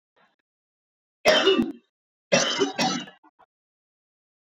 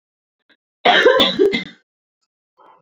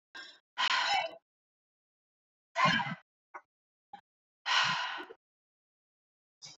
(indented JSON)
{
  "three_cough_length": "4.5 s",
  "three_cough_amplitude": 20660,
  "three_cough_signal_mean_std_ratio": 0.38,
  "cough_length": "2.8 s",
  "cough_amplitude": 28940,
  "cough_signal_mean_std_ratio": 0.42,
  "exhalation_length": "6.6 s",
  "exhalation_amplitude": 5878,
  "exhalation_signal_mean_std_ratio": 0.38,
  "survey_phase": "beta (2021-08-13 to 2022-03-07)",
  "age": "18-44",
  "gender": "Female",
  "wearing_mask": "No",
  "symptom_headache": true,
  "smoker_status": "Current smoker (11 or more cigarettes per day)",
  "respiratory_condition_asthma": false,
  "respiratory_condition_other": false,
  "recruitment_source": "Test and Trace",
  "submission_delay": "0 days",
  "covid_test_result": "Positive",
  "covid_test_method": "RT-qPCR",
  "covid_ct_value": 22.0,
  "covid_ct_gene": "ORF1ab gene"
}